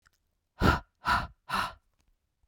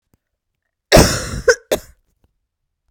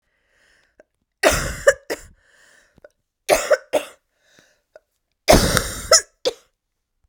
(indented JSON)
{
  "exhalation_length": "2.5 s",
  "exhalation_amplitude": 15124,
  "exhalation_signal_mean_std_ratio": 0.37,
  "cough_length": "2.9 s",
  "cough_amplitude": 32768,
  "cough_signal_mean_std_ratio": 0.3,
  "three_cough_length": "7.1 s",
  "three_cough_amplitude": 32768,
  "three_cough_signal_mean_std_ratio": 0.32,
  "survey_phase": "beta (2021-08-13 to 2022-03-07)",
  "age": "45-64",
  "gender": "Female",
  "wearing_mask": "No",
  "symptom_cough_any": true,
  "symptom_new_continuous_cough": true,
  "symptom_runny_or_blocked_nose": true,
  "symptom_fever_high_temperature": true,
  "symptom_change_to_sense_of_smell_or_taste": true,
  "symptom_loss_of_taste": true,
  "symptom_onset": "3 days",
  "smoker_status": "Never smoked",
  "respiratory_condition_asthma": false,
  "respiratory_condition_other": false,
  "recruitment_source": "Test and Trace",
  "submission_delay": "2 days",
  "covid_test_result": "Positive",
  "covid_test_method": "ePCR"
}